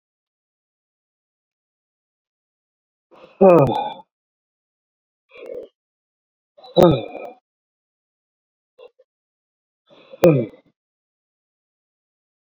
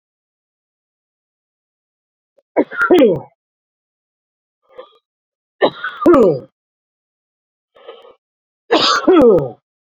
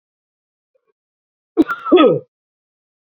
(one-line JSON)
{"exhalation_length": "12.5 s", "exhalation_amplitude": 29801, "exhalation_signal_mean_std_ratio": 0.21, "three_cough_length": "9.9 s", "three_cough_amplitude": 32768, "three_cough_signal_mean_std_ratio": 0.35, "cough_length": "3.2 s", "cough_amplitude": 28353, "cough_signal_mean_std_ratio": 0.29, "survey_phase": "beta (2021-08-13 to 2022-03-07)", "age": "45-64", "gender": "Male", "wearing_mask": "No", "symptom_sore_throat": true, "smoker_status": "Never smoked", "respiratory_condition_asthma": true, "respiratory_condition_other": false, "recruitment_source": "REACT", "submission_delay": "2 days", "covid_test_result": "Negative", "covid_test_method": "RT-qPCR", "influenza_a_test_result": "Negative", "influenza_b_test_result": "Negative"}